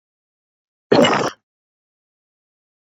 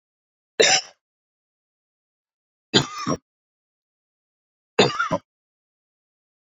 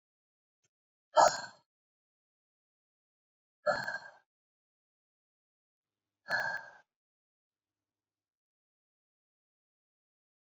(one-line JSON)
{"cough_length": "3.0 s", "cough_amplitude": 26527, "cough_signal_mean_std_ratio": 0.27, "three_cough_length": "6.5 s", "three_cough_amplitude": 32108, "three_cough_signal_mean_std_ratio": 0.26, "exhalation_length": "10.4 s", "exhalation_amplitude": 9814, "exhalation_signal_mean_std_ratio": 0.18, "survey_phase": "beta (2021-08-13 to 2022-03-07)", "age": "45-64", "gender": "Male", "wearing_mask": "No", "symptom_runny_or_blocked_nose": true, "smoker_status": "Never smoked", "respiratory_condition_asthma": false, "respiratory_condition_other": false, "recruitment_source": "REACT", "submission_delay": "2 days", "covid_test_result": "Negative", "covid_test_method": "RT-qPCR", "influenza_a_test_result": "Negative", "influenza_b_test_result": "Negative"}